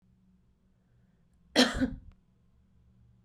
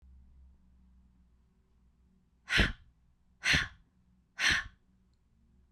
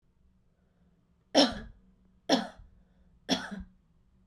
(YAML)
cough_length: 3.2 s
cough_amplitude: 11885
cough_signal_mean_std_ratio: 0.25
exhalation_length: 5.7 s
exhalation_amplitude: 6170
exhalation_signal_mean_std_ratio: 0.3
three_cough_length: 4.3 s
three_cough_amplitude: 12610
three_cough_signal_mean_std_ratio: 0.28
survey_phase: beta (2021-08-13 to 2022-03-07)
age: 18-44
gender: Female
wearing_mask: 'No'
symptom_headache: true
smoker_status: Never smoked
respiratory_condition_asthma: true
respiratory_condition_other: false
recruitment_source: REACT
submission_delay: 5 days
covid_test_result: Negative
covid_test_method: RT-qPCR
influenza_a_test_result: Negative
influenza_b_test_result: Negative